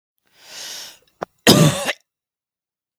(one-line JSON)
{"cough_length": "3.0 s", "cough_amplitude": 32768, "cough_signal_mean_std_ratio": 0.3, "survey_phase": "beta (2021-08-13 to 2022-03-07)", "age": "18-44", "gender": "Female", "wearing_mask": "No", "symptom_fatigue": true, "symptom_onset": "13 days", "smoker_status": "Ex-smoker", "respiratory_condition_asthma": false, "respiratory_condition_other": false, "recruitment_source": "REACT", "submission_delay": "2 days", "covid_test_result": "Negative", "covid_test_method": "RT-qPCR", "influenza_a_test_result": "Negative", "influenza_b_test_result": "Negative"}